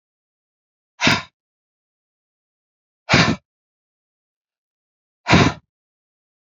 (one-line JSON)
{"exhalation_length": "6.6 s", "exhalation_amplitude": 28114, "exhalation_signal_mean_std_ratio": 0.25, "survey_phase": "beta (2021-08-13 to 2022-03-07)", "age": "45-64", "gender": "Male", "wearing_mask": "No", "symptom_none": true, "smoker_status": "Ex-smoker", "respiratory_condition_asthma": false, "respiratory_condition_other": false, "recruitment_source": "REACT", "submission_delay": "5 days", "covid_test_result": "Negative", "covid_test_method": "RT-qPCR", "influenza_a_test_result": "Negative", "influenza_b_test_result": "Negative"}